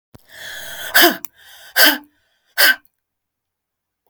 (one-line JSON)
{"exhalation_length": "4.1 s", "exhalation_amplitude": 32768, "exhalation_signal_mean_std_ratio": 0.34, "survey_phase": "beta (2021-08-13 to 2022-03-07)", "age": "65+", "gender": "Female", "wearing_mask": "No", "symptom_none": true, "smoker_status": "Ex-smoker", "respiratory_condition_asthma": false, "respiratory_condition_other": false, "recruitment_source": "REACT", "submission_delay": "2 days", "covid_test_result": "Negative", "covid_test_method": "RT-qPCR", "influenza_a_test_result": "Negative", "influenza_b_test_result": "Negative"}